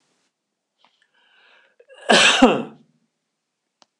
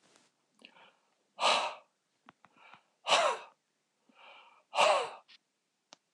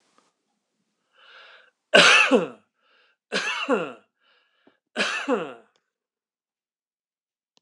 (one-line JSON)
{"cough_length": "4.0 s", "cough_amplitude": 26028, "cough_signal_mean_std_ratio": 0.28, "exhalation_length": "6.1 s", "exhalation_amplitude": 7439, "exhalation_signal_mean_std_ratio": 0.32, "three_cough_length": "7.6 s", "three_cough_amplitude": 26028, "three_cough_signal_mean_std_ratio": 0.31, "survey_phase": "beta (2021-08-13 to 2022-03-07)", "age": "65+", "gender": "Male", "wearing_mask": "No", "symptom_none": true, "smoker_status": "Ex-smoker", "respiratory_condition_asthma": false, "respiratory_condition_other": false, "recruitment_source": "REACT", "submission_delay": "1 day", "covid_test_result": "Negative", "covid_test_method": "RT-qPCR"}